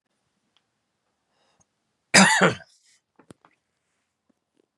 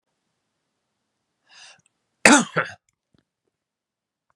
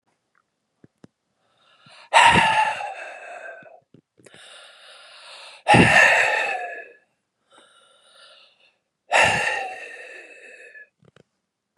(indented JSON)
{
  "three_cough_length": "4.8 s",
  "three_cough_amplitude": 28296,
  "three_cough_signal_mean_std_ratio": 0.22,
  "cough_length": "4.4 s",
  "cough_amplitude": 32768,
  "cough_signal_mean_std_ratio": 0.18,
  "exhalation_length": "11.8 s",
  "exhalation_amplitude": 26985,
  "exhalation_signal_mean_std_ratio": 0.37,
  "survey_phase": "beta (2021-08-13 to 2022-03-07)",
  "age": "45-64",
  "gender": "Male",
  "wearing_mask": "No",
  "symptom_cough_any": true,
  "symptom_runny_or_blocked_nose": true,
  "symptom_sore_throat": true,
  "symptom_headache": true,
  "symptom_onset": "2 days",
  "smoker_status": "Never smoked",
  "respiratory_condition_asthma": false,
  "respiratory_condition_other": false,
  "recruitment_source": "Test and Trace",
  "submission_delay": "1 day",
  "covid_test_result": "Positive",
  "covid_test_method": "RT-qPCR",
  "covid_ct_value": 17.8,
  "covid_ct_gene": "ORF1ab gene",
  "covid_ct_mean": 18.3,
  "covid_viral_load": "970000 copies/ml",
  "covid_viral_load_category": "Low viral load (10K-1M copies/ml)"
}